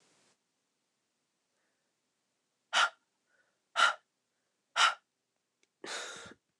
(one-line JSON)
{"exhalation_length": "6.6 s", "exhalation_amplitude": 7471, "exhalation_signal_mean_std_ratio": 0.24, "survey_phase": "alpha (2021-03-01 to 2021-08-12)", "age": "18-44", "gender": "Female", "wearing_mask": "No", "symptom_cough_any": true, "symptom_fatigue": true, "symptom_headache": true, "symptom_change_to_sense_of_smell_or_taste": true, "symptom_loss_of_taste": true, "symptom_onset": "4 days", "smoker_status": "Never smoked", "respiratory_condition_asthma": false, "respiratory_condition_other": false, "recruitment_source": "Test and Trace", "submission_delay": "2 days", "covid_test_result": "Positive", "covid_test_method": "RT-qPCR", "covid_ct_value": 25.2, "covid_ct_gene": "N gene"}